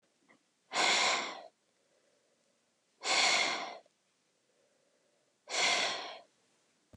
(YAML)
exhalation_length: 7.0 s
exhalation_amplitude: 5871
exhalation_signal_mean_std_ratio: 0.42
survey_phase: beta (2021-08-13 to 2022-03-07)
age: 45-64
gender: Female
wearing_mask: 'No'
symptom_none: true
smoker_status: Ex-smoker
respiratory_condition_asthma: false
respiratory_condition_other: false
recruitment_source: REACT
submission_delay: 2 days
covid_test_result: Negative
covid_test_method: RT-qPCR
influenza_a_test_result: Negative
influenza_b_test_result: Negative